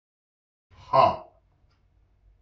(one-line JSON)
{"exhalation_length": "2.4 s", "exhalation_amplitude": 15456, "exhalation_signal_mean_std_ratio": 0.25, "survey_phase": "beta (2021-08-13 to 2022-03-07)", "age": "45-64", "gender": "Male", "wearing_mask": "No", "symptom_cough_any": true, "symptom_runny_or_blocked_nose": true, "symptom_sore_throat": true, "symptom_onset": "2 days", "smoker_status": "Ex-smoker", "respiratory_condition_asthma": false, "respiratory_condition_other": false, "recruitment_source": "Test and Trace", "submission_delay": "1 day", "covid_test_result": "Negative", "covid_test_method": "ePCR"}